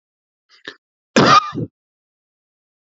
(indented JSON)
{
  "cough_length": "3.0 s",
  "cough_amplitude": 29723,
  "cough_signal_mean_std_ratio": 0.28,
  "survey_phase": "beta (2021-08-13 to 2022-03-07)",
  "age": "45-64",
  "gender": "Male",
  "wearing_mask": "No",
  "symptom_none": true,
  "smoker_status": "Ex-smoker",
  "respiratory_condition_asthma": false,
  "respiratory_condition_other": false,
  "recruitment_source": "REACT",
  "submission_delay": "1 day",
  "covid_test_result": "Negative",
  "covid_test_method": "RT-qPCR",
  "influenza_a_test_result": "Negative",
  "influenza_b_test_result": "Negative"
}